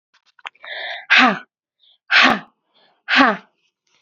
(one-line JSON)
{"exhalation_length": "4.0 s", "exhalation_amplitude": 32767, "exhalation_signal_mean_std_ratio": 0.37, "survey_phase": "beta (2021-08-13 to 2022-03-07)", "age": "18-44", "gender": "Female", "wearing_mask": "No", "symptom_cough_any": true, "symptom_shortness_of_breath": true, "symptom_fatigue": true, "symptom_fever_high_temperature": true, "symptom_headache": true, "symptom_onset": "2 days", "smoker_status": "Never smoked", "respiratory_condition_asthma": false, "respiratory_condition_other": false, "recruitment_source": "Test and Trace", "submission_delay": "2 days", "covid_test_result": "Positive", "covid_test_method": "RT-qPCR"}